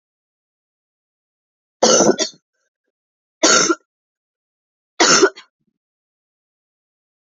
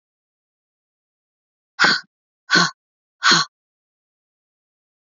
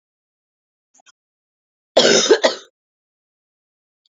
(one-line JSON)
{"three_cough_length": "7.3 s", "three_cough_amplitude": 32768, "three_cough_signal_mean_std_ratio": 0.29, "exhalation_length": "5.1 s", "exhalation_amplitude": 26908, "exhalation_signal_mean_std_ratio": 0.26, "cough_length": "4.2 s", "cough_amplitude": 30514, "cough_signal_mean_std_ratio": 0.27, "survey_phase": "beta (2021-08-13 to 2022-03-07)", "age": "18-44", "gender": "Female", "wearing_mask": "No", "symptom_cough_any": true, "symptom_new_continuous_cough": true, "symptom_runny_or_blocked_nose": true, "symptom_sore_throat": true, "symptom_headache": true, "symptom_change_to_sense_of_smell_or_taste": true, "symptom_onset": "3 days", "smoker_status": "Never smoked", "respiratory_condition_asthma": false, "respiratory_condition_other": false, "recruitment_source": "Test and Trace", "submission_delay": "2 days", "covid_test_result": "Positive", "covid_test_method": "RT-qPCR", "covid_ct_value": 21.5, "covid_ct_gene": "ORF1ab gene", "covid_ct_mean": 22.1, "covid_viral_load": "57000 copies/ml", "covid_viral_load_category": "Low viral load (10K-1M copies/ml)"}